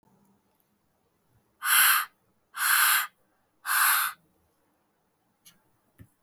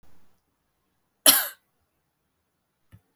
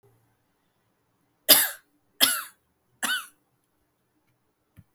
{
  "exhalation_length": "6.2 s",
  "exhalation_amplitude": 13216,
  "exhalation_signal_mean_std_ratio": 0.38,
  "cough_length": "3.2 s",
  "cough_amplitude": 32768,
  "cough_signal_mean_std_ratio": 0.19,
  "three_cough_length": "4.9 s",
  "three_cough_amplitude": 32766,
  "three_cough_signal_mean_std_ratio": 0.23,
  "survey_phase": "beta (2021-08-13 to 2022-03-07)",
  "age": "18-44",
  "gender": "Female",
  "wearing_mask": "No",
  "symptom_headache": true,
  "smoker_status": "Current smoker (1 to 10 cigarettes per day)",
  "respiratory_condition_asthma": false,
  "respiratory_condition_other": false,
  "recruitment_source": "REACT",
  "submission_delay": "12 days",
  "covid_test_result": "Negative",
  "covid_test_method": "RT-qPCR",
  "influenza_a_test_result": "Negative",
  "influenza_b_test_result": "Negative"
}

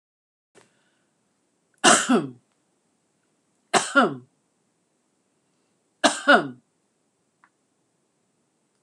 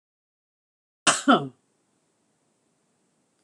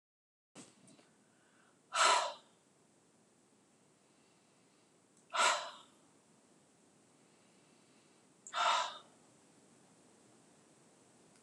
{
  "three_cough_length": "8.8 s",
  "three_cough_amplitude": 25627,
  "three_cough_signal_mean_std_ratio": 0.25,
  "cough_length": "3.4 s",
  "cough_amplitude": 23144,
  "cough_signal_mean_std_ratio": 0.21,
  "exhalation_length": "11.4 s",
  "exhalation_amplitude": 5162,
  "exhalation_signal_mean_std_ratio": 0.27,
  "survey_phase": "beta (2021-08-13 to 2022-03-07)",
  "age": "65+",
  "gender": "Female",
  "wearing_mask": "Prefer not to say",
  "symptom_none": true,
  "smoker_status": "Never smoked",
  "respiratory_condition_asthma": false,
  "respiratory_condition_other": false,
  "recruitment_source": "REACT",
  "submission_delay": "3 days",
  "covid_test_result": "Negative",
  "covid_test_method": "RT-qPCR",
  "influenza_a_test_result": "Negative",
  "influenza_b_test_result": "Negative"
}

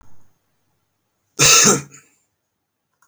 {
  "cough_length": "3.1 s",
  "cough_amplitude": 32768,
  "cough_signal_mean_std_ratio": 0.31,
  "survey_phase": "beta (2021-08-13 to 2022-03-07)",
  "age": "18-44",
  "gender": "Male",
  "wearing_mask": "No",
  "symptom_none": true,
  "smoker_status": "Never smoked",
  "respiratory_condition_asthma": false,
  "respiratory_condition_other": false,
  "recruitment_source": "REACT",
  "submission_delay": "2 days",
  "covid_test_result": "Negative",
  "covid_test_method": "RT-qPCR"
}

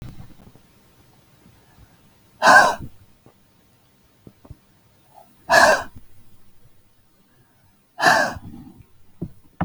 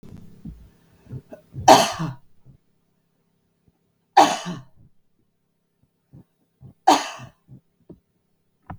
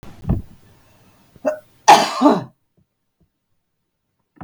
{
  "exhalation_length": "9.6 s",
  "exhalation_amplitude": 32768,
  "exhalation_signal_mean_std_ratio": 0.29,
  "three_cough_length": "8.8 s",
  "three_cough_amplitude": 32768,
  "three_cough_signal_mean_std_ratio": 0.24,
  "cough_length": "4.4 s",
  "cough_amplitude": 32768,
  "cough_signal_mean_std_ratio": 0.3,
  "survey_phase": "beta (2021-08-13 to 2022-03-07)",
  "age": "45-64",
  "gender": "Female",
  "wearing_mask": "No",
  "symptom_none": true,
  "smoker_status": "Never smoked",
  "respiratory_condition_asthma": false,
  "respiratory_condition_other": false,
  "recruitment_source": "REACT",
  "submission_delay": "5 days",
  "covid_test_result": "Negative",
  "covid_test_method": "RT-qPCR",
  "influenza_a_test_result": "Negative",
  "influenza_b_test_result": "Negative"
}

